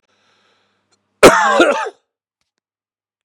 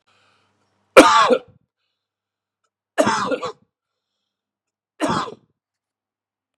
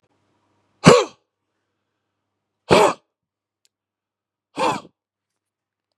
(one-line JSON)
{"cough_length": "3.2 s", "cough_amplitude": 32768, "cough_signal_mean_std_ratio": 0.32, "three_cough_length": "6.6 s", "three_cough_amplitude": 32768, "three_cough_signal_mean_std_ratio": 0.27, "exhalation_length": "6.0 s", "exhalation_amplitude": 32768, "exhalation_signal_mean_std_ratio": 0.23, "survey_phase": "beta (2021-08-13 to 2022-03-07)", "age": "45-64", "gender": "Male", "wearing_mask": "No", "symptom_runny_or_blocked_nose": true, "symptom_onset": "3 days", "smoker_status": "Never smoked", "respiratory_condition_asthma": false, "respiratory_condition_other": false, "recruitment_source": "Test and Trace", "submission_delay": "2 days", "covid_test_result": "Positive", "covid_test_method": "RT-qPCR", "covid_ct_value": 26.1, "covid_ct_gene": "ORF1ab gene", "covid_ct_mean": 26.6, "covid_viral_load": "2000 copies/ml", "covid_viral_load_category": "Minimal viral load (< 10K copies/ml)"}